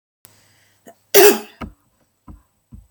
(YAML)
cough_length: 2.9 s
cough_amplitude: 32768
cough_signal_mean_std_ratio: 0.25
survey_phase: beta (2021-08-13 to 2022-03-07)
age: 18-44
gender: Female
wearing_mask: 'No'
symptom_cough_any: true
symptom_runny_or_blocked_nose: true
symptom_sore_throat: true
symptom_diarrhoea: true
symptom_fatigue: true
symptom_headache: true
symptom_other: true
smoker_status: Never smoked
respiratory_condition_asthma: false
respiratory_condition_other: false
recruitment_source: Test and Trace
submission_delay: 2 days
covid_test_result: Positive
covid_test_method: RT-qPCR
covid_ct_value: 31.4
covid_ct_gene: N gene